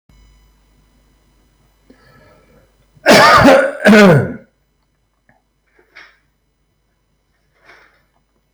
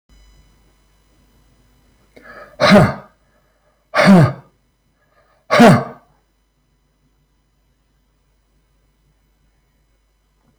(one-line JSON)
{"cough_length": "8.5 s", "cough_amplitude": 32768, "cough_signal_mean_std_ratio": 0.32, "exhalation_length": "10.6 s", "exhalation_amplitude": 32768, "exhalation_signal_mean_std_ratio": 0.26, "survey_phase": "alpha (2021-03-01 to 2021-08-12)", "age": "65+", "gender": "Male", "wearing_mask": "No", "symptom_none": true, "smoker_status": "Never smoked", "respiratory_condition_asthma": false, "respiratory_condition_other": false, "recruitment_source": "REACT", "submission_delay": "5 days", "covid_test_result": "Negative", "covid_test_method": "RT-qPCR"}